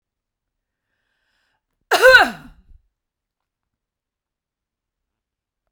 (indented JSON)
{
  "cough_length": "5.7 s",
  "cough_amplitude": 32768,
  "cough_signal_mean_std_ratio": 0.2,
  "survey_phase": "beta (2021-08-13 to 2022-03-07)",
  "age": "45-64",
  "gender": "Female",
  "wearing_mask": "No",
  "symptom_headache": true,
  "smoker_status": "Never smoked",
  "respiratory_condition_asthma": false,
  "respiratory_condition_other": false,
  "recruitment_source": "REACT",
  "submission_delay": "1 day",
  "covid_test_result": "Negative",
  "covid_test_method": "RT-qPCR"
}